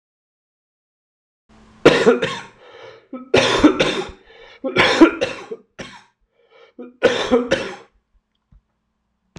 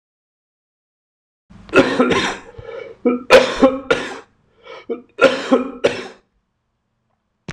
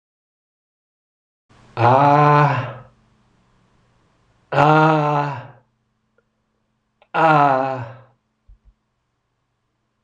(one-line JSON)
{"cough_length": "9.4 s", "cough_amplitude": 26028, "cough_signal_mean_std_ratio": 0.38, "three_cough_length": "7.5 s", "three_cough_amplitude": 26028, "three_cough_signal_mean_std_ratio": 0.39, "exhalation_length": "10.0 s", "exhalation_amplitude": 26028, "exhalation_signal_mean_std_ratio": 0.4, "survey_phase": "alpha (2021-03-01 to 2021-08-12)", "age": "65+", "gender": "Male", "wearing_mask": "No", "symptom_cough_any": true, "smoker_status": "Never smoked", "respiratory_condition_asthma": false, "respiratory_condition_other": false, "recruitment_source": "REACT", "submission_delay": "3 days", "covid_test_result": "Negative", "covid_test_method": "RT-qPCR"}